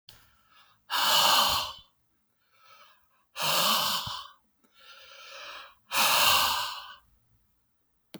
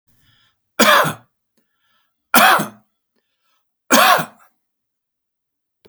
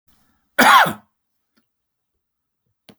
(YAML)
exhalation_length: 8.2 s
exhalation_amplitude: 10817
exhalation_signal_mean_std_ratio: 0.47
three_cough_length: 5.9 s
three_cough_amplitude: 32768
three_cough_signal_mean_std_ratio: 0.33
cough_length: 3.0 s
cough_amplitude: 31516
cough_signal_mean_std_ratio: 0.26
survey_phase: alpha (2021-03-01 to 2021-08-12)
age: 65+
gender: Male
wearing_mask: 'No'
symptom_none: true
smoker_status: Ex-smoker
respiratory_condition_asthma: false
respiratory_condition_other: false
recruitment_source: REACT
submission_delay: 2 days
covid_test_result: Negative
covid_test_method: RT-qPCR